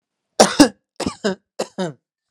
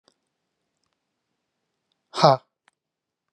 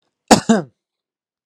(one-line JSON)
{"three_cough_length": "2.3 s", "three_cough_amplitude": 32768, "three_cough_signal_mean_std_ratio": 0.31, "exhalation_length": "3.3 s", "exhalation_amplitude": 29159, "exhalation_signal_mean_std_ratio": 0.16, "cough_length": "1.5 s", "cough_amplitude": 32768, "cough_signal_mean_std_ratio": 0.28, "survey_phase": "alpha (2021-03-01 to 2021-08-12)", "age": "45-64", "gender": "Male", "wearing_mask": "No", "symptom_none": true, "smoker_status": "Never smoked", "respiratory_condition_asthma": false, "respiratory_condition_other": false, "recruitment_source": "REACT", "submission_delay": "2 days", "covid_test_result": "Negative", "covid_test_method": "RT-qPCR"}